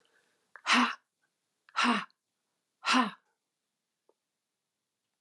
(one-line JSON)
{"exhalation_length": "5.2 s", "exhalation_amplitude": 9324, "exhalation_signal_mean_std_ratio": 0.3, "survey_phase": "beta (2021-08-13 to 2022-03-07)", "age": "65+", "gender": "Female", "wearing_mask": "No", "symptom_none": true, "smoker_status": "Never smoked", "respiratory_condition_asthma": false, "respiratory_condition_other": false, "recruitment_source": "REACT", "submission_delay": "2 days", "covid_test_result": "Negative", "covid_test_method": "RT-qPCR", "influenza_a_test_result": "Unknown/Void", "influenza_b_test_result": "Unknown/Void"}